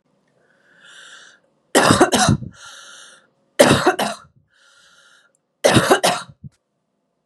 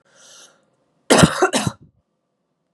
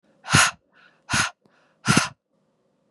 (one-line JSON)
{"three_cough_length": "7.3 s", "three_cough_amplitude": 32768, "three_cough_signal_mean_std_ratio": 0.37, "cough_length": "2.7 s", "cough_amplitude": 32768, "cough_signal_mean_std_ratio": 0.31, "exhalation_length": "2.9 s", "exhalation_amplitude": 28123, "exhalation_signal_mean_std_ratio": 0.35, "survey_phase": "beta (2021-08-13 to 2022-03-07)", "age": "18-44", "gender": "Female", "wearing_mask": "No", "symptom_cough_any": true, "symptom_new_continuous_cough": true, "symptom_runny_or_blocked_nose": true, "symptom_headache": true, "symptom_onset": "3 days", "smoker_status": "Never smoked", "respiratory_condition_asthma": false, "respiratory_condition_other": false, "recruitment_source": "Test and Trace", "submission_delay": "2 days", "covid_test_result": "Positive", "covid_test_method": "RT-qPCR"}